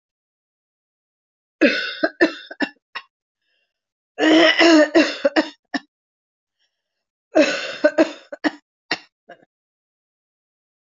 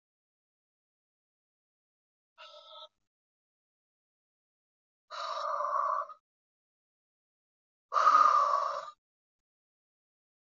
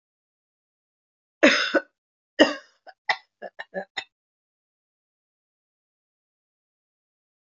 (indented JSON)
{
  "three_cough_length": "10.8 s",
  "three_cough_amplitude": 26179,
  "three_cough_signal_mean_std_ratio": 0.35,
  "exhalation_length": "10.6 s",
  "exhalation_amplitude": 8289,
  "exhalation_signal_mean_std_ratio": 0.3,
  "cough_length": "7.6 s",
  "cough_amplitude": 24388,
  "cough_signal_mean_std_ratio": 0.2,
  "survey_phase": "beta (2021-08-13 to 2022-03-07)",
  "age": "65+",
  "gender": "Female",
  "wearing_mask": "No",
  "symptom_cough_any": true,
  "symptom_new_continuous_cough": true,
  "symptom_runny_or_blocked_nose": true,
  "smoker_status": "Never smoked",
  "respiratory_condition_asthma": false,
  "respiratory_condition_other": false,
  "recruitment_source": "Test and Trace",
  "submission_delay": "2 days",
  "covid_test_result": "Positive",
  "covid_test_method": "RT-qPCR",
  "covid_ct_value": 25.8,
  "covid_ct_gene": "ORF1ab gene",
  "covid_ct_mean": 26.1,
  "covid_viral_load": "2700 copies/ml",
  "covid_viral_load_category": "Minimal viral load (< 10K copies/ml)"
}